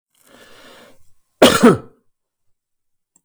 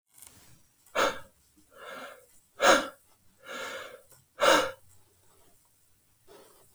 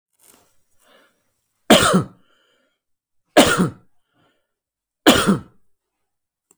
{"cough_length": "3.2 s", "cough_amplitude": 32768, "cough_signal_mean_std_ratio": 0.26, "exhalation_length": "6.7 s", "exhalation_amplitude": 14684, "exhalation_signal_mean_std_ratio": 0.31, "three_cough_length": "6.6 s", "three_cough_amplitude": 32768, "three_cough_signal_mean_std_ratio": 0.29, "survey_phase": "beta (2021-08-13 to 2022-03-07)", "age": "45-64", "gender": "Male", "wearing_mask": "No", "symptom_abdominal_pain": true, "symptom_fatigue": true, "symptom_headache": true, "smoker_status": "Never smoked", "respiratory_condition_asthma": false, "respiratory_condition_other": false, "recruitment_source": "REACT", "submission_delay": "16 days", "covid_test_result": "Negative", "covid_test_method": "RT-qPCR", "influenza_a_test_result": "Negative", "influenza_b_test_result": "Negative"}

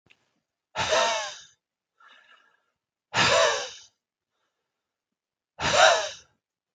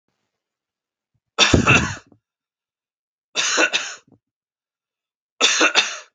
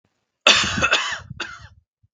{"exhalation_length": "6.7 s", "exhalation_amplitude": 20706, "exhalation_signal_mean_std_ratio": 0.37, "three_cough_length": "6.1 s", "three_cough_amplitude": 32768, "three_cough_signal_mean_std_ratio": 0.37, "cough_length": "2.1 s", "cough_amplitude": 32768, "cough_signal_mean_std_ratio": 0.45, "survey_phase": "beta (2021-08-13 to 2022-03-07)", "age": "45-64", "gender": "Male", "wearing_mask": "No", "symptom_none": true, "smoker_status": "Ex-smoker", "respiratory_condition_asthma": false, "respiratory_condition_other": false, "recruitment_source": "REACT", "submission_delay": "2 days", "covid_test_result": "Negative", "covid_test_method": "RT-qPCR", "influenza_a_test_result": "Unknown/Void", "influenza_b_test_result": "Unknown/Void"}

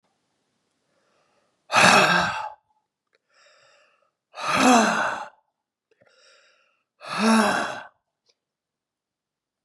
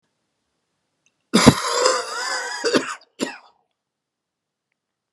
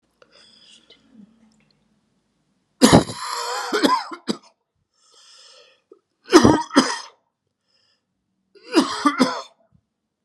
{"exhalation_length": "9.6 s", "exhalation_amplitude": 29228, "exhalation_signal_mean_std_ratio": 0.37, "cough_length": "5.1 s", "cough_amplitude": 32768, "cough_signal_mean_std_ratio": 0.36, "three_cough_length": "10.2 s", "three_cough_amplitude": 32768, "three_cough_signal_mean_std_ratio": 0.31, "survey_phase": "beta (2021-08-13 to 2022-03-07)", "age": "45-64", "gender": "Male", "wearing_mask": "No", "symptom_cough_any": true, "symptom_runny_or_blocked_nose": true, "symptom_sore_throat": true, "symptom_fatigue": true, "symptom_fever_high_temperature": true, "symptom_headache": true, "symptom_onset": "7 days", "smoker_status": "Never smoked", "respiratory_condition_asthma": false, "respiratory_condition_other": false, "recruitment_source": "Test and Trace", "submission_delay": "2 days", "covid_test_result": "Positive", "covid_test_method": "RT-qPCR", "covid_ct_value": 21.4, "covid_ct_gene": "ORF1ab gene", "covid_ct_mean": 21.9, "covid_viral_load": "68000 copies/ml", "covid_viral_load_category": "Low viral load (10K-1M copies/ml)"}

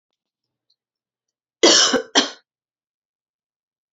{"cough_length": "3.9 s", "cough_amplitude": 30897, "cough_signal_mean_std_ratio": 0.27, "survey_phase": "beta (2021-08-13 to 2022-03-07)", "age": "45-64", "gender": "Female", "wearing_mask": "No", "symptom_cough_any": true, "symptom_runny_or_blocked_nose": true, "symptom_sore_throat": true, "symptom_other": true, "smoker_status": "Never smoked", "respiratory_condition_asthma": true, "respiratory_condition_other": false, "recruitment_source": "Test and Trace", "submission_delay": "0 days", "covid_test_result": "Positive", "covid_test_method": "LFT"}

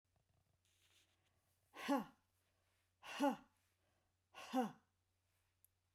{"exhalation_length": "5.9 s", "exhalation_amplitude": 1349, "exhalation_signal_mean_std_ratio": 0.27, "survey_phase": "beta (2021-08-13 to 2022-03-07)", "age": "65+", "gender": "Female", "wearing_mask": "No", "symptom_none": true, "smoker_status": "Never smoked", "respiratory_condition_asthma": false, "respiratory_condition_other": true, "recruitment_source": "REACT", "submission_delay": "0 days", "covid_test_result": "Negative", "covid_test_method": "RT-qPCR"}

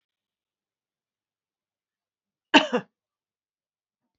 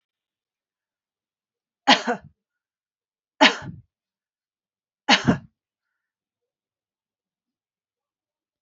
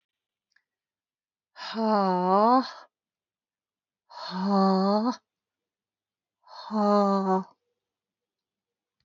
{"cough_length": "4.2 s", "cough_amplitude": 27070, "cough_signal_mean_std_ratio": 0.14, "three_cough_length": "8.6 s", "three_cough_amplitude": 30059, "three_cough_signal_mean_std_ratio": 0.19, "exhalation_length": "9.0 s", "exhalation_amplitude": 11737, "exhalation_signal_mean_std_ratio": 0.43, "survey_phase": "beta (2021-08-13 to 2022-03-07)", "age": "45-64", "gender": "Female", "wearing_mask": "No", "symptom_change_to_sense_of_smell_or_taste": true, "smoker_status": "Never smoked", "respiratory_condition_asthma": false, "respiratory_condition_other": false, "recruitment_source": "Test and Trace", "submission_delay": "2 days", "covid_test_result": "Positive", "covid_test_method": "RT-qPCR"}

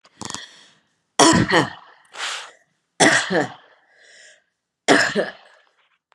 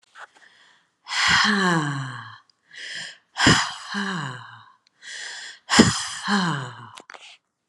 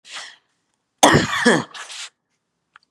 {"three_cough_length": "6.1 s", "three_cough_amplitude": 32758, "three_cough_signal_mean_std_ratio": 0.38, "exhalation_length": "7.7 s", "exhalation_amplitude": 31653, "exhalation_signal_mean_std_ratio": 0.48, "cough_length": "2.9 s", "cough_amplitude": 32768, "cough_signal_mean_std_ratio": 0.36, "survey_phase": "beta (2021-08-13 to 2022-03-07)", "age": "65+", "gender": "Female", "wearing_mask": "No", "symptom_none": true, "smoker_status": "Never smoked", "respiratory_condition_asthma": false, "respiratory_condition_other": false, "recruitment_source": "REACT", "submission_delay": "1 day", "covid_test_result": "Negative", "covid_test_method": "RT-qPCR", "influenza_a_test_result": "Negative", "influenza_b_test_result": "Negative"}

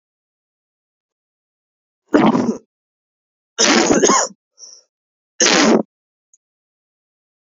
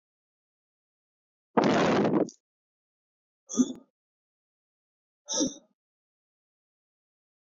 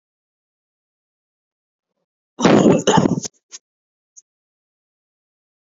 {"three_cough_length": "7.6 s", "three_cough_amplitude": 32768, "three_cough_signal_mean_std_ratio": 0.36, "exhalation_length": "7.4 s", "exhalation_amplitude": 15280, "exhalation_signal_mean_std_ratio": 0.31, "cough_length": "5.7 s", "cough_amplitude": 28389, "cough_signal_mean_std_ratio": 0.28, "survey_phase": "beta (2021-08-13 to 2022-03-07)", "age": "18-44", "gender": "Male", "wearing_mask": "Yes", "symptom_new_continuous_cough": true, "symptom_sore_throat": true, "symptom_onset": "12 days", "smoker_status": "Never smoked", "respiratory_condition_asthma": false, "respiratory_condition_other": false, "recruitment_source": "REACT", "submission_delay": "1 day", "covid_test_result": "Negative", "covid_test_method": "RT-qPCR", "influenza_a_test_result": "Unknown/Void", "influenza_b_test_result": "Unknown/Void"}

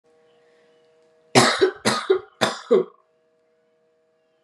{"three_cough_length": "4.4 s", "three_cough_amplitude": 31153, "three_cough_signal_mean_std_ratio": 0.35, "survey_phase": "beta (2021-08-13 to 2022-03-07)", "age": "18-44", "gender": "Female", "wearing_mask": "No", "symptom_none": true, "symptom_onset": "8 days", "smoker_status": "Never smoked", "respiratory_condition_asthma": false, "respiratory_condition_other": false, "recruitment_source": "REACT", "submission_delay": "1 day", "covid_test_result": "Negative", "covid_test_method": "RT-qPCR", "influenza_a_test_result": "Negative", "influenza_b_test_result": "Negative"}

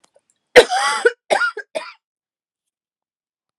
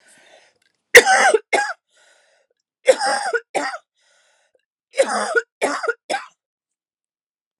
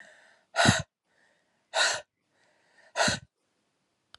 {"cough_length": "3.6 s", "cough_amplitude": 32768, "cough_signal_mean_std_ratio": 0.3, "three_cough_length": "7.6 s", "three_cough_amplitude": 32768, "three_cough_signal_mean_std_ratio": 0.34, "exhalation_length": "4.2 s", "exhalation_amplitude": 15877, "exhalation_signal_mean_std_ratio": 0.32, "survey_phase": "alpha (2021-03-01 to 2021-08-12)", "age": "18-44", "gender": "Female", "wearing_mask": "No", "symptom_cough_any": true, "symptom_new_continuous_cough": true, "symptom_shortness_of_breath": true, "symptom_fatigue": true, "symptom_headache": true, "symptom_change_to_sense_of_smell_or_taste": true, "symptom_loss_of_taste": true, "symptom_onset": "4 days", "smoker_status": "Never smoked", "respiratory_condition_asthma": false, "respiratory_condition_other": false, "recruitment_source": "Test and Trace", "submission_delay": "3 days", "covid_test_result": "Positive", "covid_test_method": "RT-qPCR", "covid_ct_value": 13.8, "covid_ct_gene": "ORF1ab gene", "covid_ct_mean": 14.0, "covid_viral_load": "26000000 copies/ml", "covid_viral_load_category": "High viral load (>1M copies/ml)"}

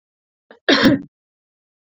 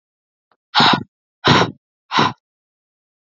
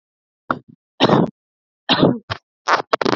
{"cough_length": "1.9 s", "cough_amplitude": 27848, "cough_signal_mean_std_ratio": 0.33, "exhalation_length": "3.2 s", "exhalation_amplitude": 32324, "exhalation_signal_mean_std_ratio": 0.36, "three_cough_length": "3.2 s", "three_cough_amplitude": 30323, "three_cough_signal_mean_std_ratio": 0.39, "survey_phase": "beta (2021-08-13 to 2022-03-07)", "age": "18-44", "gender": "Female", "wearing_mask": "No", "symptom_none": true, "smoker_status": "Never smoked", "respiratory_condition_asthma": false, "respiratory_condition_other": false, "recruitment_source": "REACT", "submission_delay": "10 days", "covid_test_result": "Negative", "covid_test_method": "RT-qPCR", "influenza_a_test_result": "Negative", "influenza_b_test_result": "Negative"}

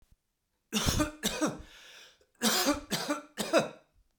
{"cough_length": "4.2 s", "cough_amplitude": 8764, "cough_signal_mean_std_ratio": 0.51, "survey_phase": "beta (2021-08-13 to 2022-03-07)", "age": "45-64", "gender": "Male", "wearing_mask": "No", "symptom_none": true, "smoker_status": "Never smoked", "respiratory_condition_asthma": false, "respiratory_condition_other": false, "recruitment_source": "REACT", "submission_delay": "3 days", "covid_test_result": "Negative", "covid_test_method": "RT-qPCR", "influenza_a_test_result": "Negative", "influenza_b_test_result": "Negative"}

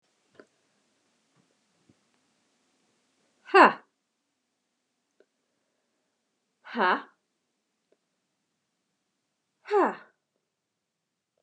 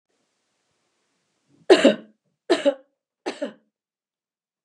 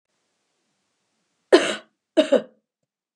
{"exhalation_length": "11.4 s", "exhalation_amplitude": 26667, "exhalation_signal_mean_std_ratio": 0.16, "three_cough_length": "4.6 s", "three_cough_amplitude": 30514, "three_cough_signal_mean_std_ratio": 0.23, "cough_length": "3.2 s", "cough_amplitude": 30722, "cough_signal_mean_std_ratio": 0.25, "survey_phase": "beta (2021-08-13 to 2022-03-07)", "age": "45-64", "gender": "Female", "wearing_mask": "No", "symptom_none": true, "smoker_status": "Never smoked", "respiratory_condition_asthma": false, "respiratory_condition_other": false, "recruitment_source": "REACT", "submission_delay": "3 days", "covid_test_result": "Negative", "covid_test_method": "RT-qPCR", "influenza_a_test_result": "Negative", "influenza_b_test_result": "Negative"}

